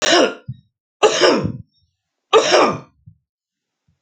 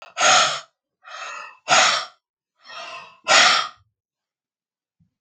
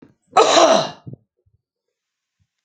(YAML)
three_cough_length: 4.0 s
three_cough_amplitude: 32768
three_cough_signal_mean_std_ratio: 0.45
exhalation_length: 5.2 s
exhalation_amplitude: 28613
exhalation_signal_mean_std_ratio: 0.41
cough_length: 2.6 s
cough_amplitude: 32768
cough_signal_mean_std_ratio: 0.36
survey_phase: beta (2021-08-13 to 2022-03-07)
age: 45-64
gender: Male
wearing_mask: 'No'
symptom_cough_any: true
smoker_status: Ex-smoker
respiratory_condition_asthma: false
respiratory_condition_other: false
recruitment_source: REACT
submission_delay: 1 day
covid_test_result: Negative
covid_test_method: RT-qPCR
influenza_a_test_result: Negative
influenza_b_test_result: Negative